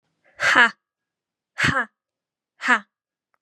{"exhalation_length": "3.4 s", "exhalation_amplitude": 29511, "exhalation_signal_mean_std_ratio": 0.33, "survey_phase": "beta (2021-08-13 to 2022-03-07)", "age": "18-44", "gender": "Female", "wearing_mask": "No", "symptom_cough_any": true, "symptom_runny_or_blocked_nose": true, "symptom_onset": "12 days", "smoker_status": "Ex-smoker", "respiratory_condition_asthma": false, "respiratory_condition_other": false, "recruitment_source": "REACT", "submission_delay": "2 days", "covid_test_result": "Negative", "covid_test_method": "RT-qPCR", "influenza_a_test_result": "Negative", "influenza_b_test_result": "Negative"}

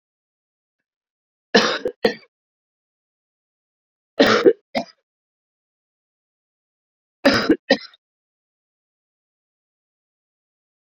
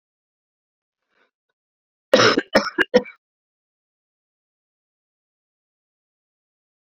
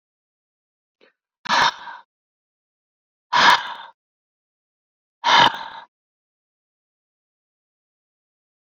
{"three_cough_length": "10.8 s", "three_cough_amplitude": 28235, "three_cough_signal_mean_std_ratio": 0.23, "cough_length": "6.8 s", "cough_amplitude": 27825, "cough_signal_mean_std_ratio": 0.2, "exhalation_length": "8.6 s", "exhalation_amplitude": 29918, "exhalation_signal_mean_std_ratio": 0.26, "survey_phase": "beta (2021-08-13 to 2022-03-07)", "age": "65+", "gender": "Female", "wearing_mask": "No", "symptom_none": true, "smoker_status": "Ex-smoker", "respiratory_condition_asthma": false, "respiratory_condition_other": false, "recruitment_source": "REACT", "submission_delay": "1 day", "covid_test_result": "Negative", "covid_test_method": "RT-qPCR"}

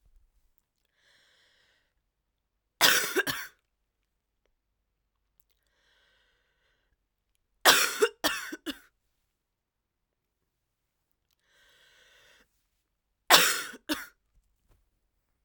{"three_cough_length": "15.4 s", "three_cough_amplitude": 26197, "three_cough_signal_mean_std_ratio": 0.22, "survey_phase": "alpha (2021-03-01 to 2021-08-12)", "age": "18-44", "gender": "Female", "wearing_mask": "No", "symptom_cough_any": true, "symptom_new_continuous_cough": true, "symptom_shortness_of_breath": true, "symptom_diarrhoea": true, "symptom_fatigue": true, "symptom_fever_high_temperature": true, "symptom_headache": true, "symptom_change_to_sense_of_smell_or_taste": true, "symptom_loss_of_taste": true, "symptom_onset": "3 days", "smoker_status": "Current smoker (1 to 10 cigarettes per day)", "respiratory_condition_asthma": false, "respiratory_condition_other": false, "recruitment_source": "Test and Trace", "submission_delay": "2 days", "covid_test_result": "Positive", "covid_test_method": "RT-qPCR"}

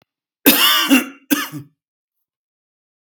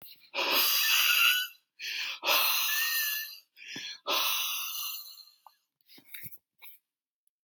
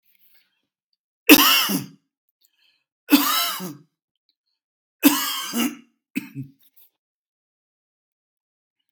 {"cough_length": "3.1 s", "cough_amplitude": 32768, "cough_signal_mean_std_ratio": 0.39, "exhalation_length": "7.4 s", "exhalation_amplitude": 9906, "exhalation_signal_mean_std_ratio": 0.61, "three_cough_length": "8.9 s", "three_cough_amplitude": 32768, "three_cough_signal_mean_std_ratio": 0.3, "survey_phase": "beta (2021-08-13 to 2022-03-07)", "age": "65+", "gender": "Male", "wearing_mask": "No", "symptom_runny_or_blocked_nose": true, "smoker_status": "Never smoked", "respiratory_condition_asthma": false, "respiratory_condition_other": false, "recruitment_source": "REACT", "submission_delay": "2 days", "covid_test_result": "Negative", "covid_test_method": "RT-qPCR"}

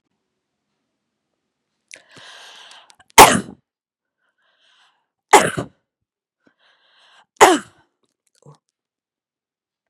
{"three_cough_length": "9.9 s", "three_cough_amplitude": 32768, "three_cough_signal_mean_std_ratio": 0.18, "survey_phase": "beta (2021-08-13 to 2022-03-07)", "age": "65+", "gender": "Female", "wearing_mask": "No", "symptom_none": true, "smoker_status": "Never smoked", "respiratory_condition_asthma": false, "respiratory_condition_other": false, "recruitment_source": "REACT", "submission_delay": "2 days", "covid_test_result": "Negative", "covid_test_method": "RT-qPCR"}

